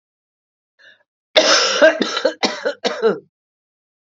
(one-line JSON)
{"cough_length": "4.1 s", "cough_amplitude": 32768, "cough_signal_mean_std_ratio": 0.44, "survey_phase": "alpha (2021-03-01 to 2021-08-12)", "age": "65+", "gender": "Female", "wearing_mask": "No", "symptom_cough_any": true, "symptom_onset": "5 days", "smoker_status": "Never smoked", "respiratory_condition_asthma": true, "respiratory_condition_other": false, "recruitment_source": "Test and Trace", "submission_delay": "1 day", "covid_test_result": "Positive", "covid_test_method": "RT-qPCR"}